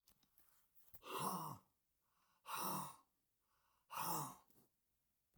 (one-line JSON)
{"exhalation_length": "5.4 s", "exhalation_amplitude": 979, "exhalation_signal_mean_std_ratio": 0.44, "survey_phase": "alpha (2021-03-01 to 2021-08-12)", "age": "65+", "gender": "Male", "wearing_mask": "No", "symptom_none": true, "smoker_status": "Ex-smoker", "respiratory_condition_asthma": false, "respiratory_condition_other": false, "recruitment_source": "REACT", "submission_delay": "2 days", "covid_test_result": "Negative", "covid_test_method": "RT-qPCR"}